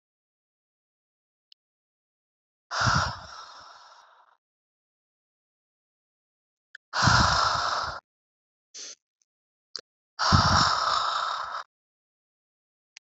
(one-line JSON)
{"exhalation_length": "13.1 s", "exhalation_amplitude": 23300, "exhalation_signal_mean_std_ratio": 0.37, "survey_phase": "beta (2021-08-13 to 2022-03-07)", "age": "18-44", "gender": "Female", "wearing_mask": "No", "symptom_runny_or_blocked_nose": true, "symptom_shortness_of_breath": true, "symptom_fatigue": true, "symptom_headache": true, "symptom_other": true, "symptom_onset": "4 days", "smoker_status": "Never smoked", "respiratory_condition_asthma": false, "respiratory_condition_other": false, "recruitment_source": "Test and Trace", "submission_delay": "2 days", "covid_test_result": "Positive", "covid_test_method": "RT-qPCR", "covid_ct_value": 22.8, "covid_ct_gene": "ORF1ab gene"}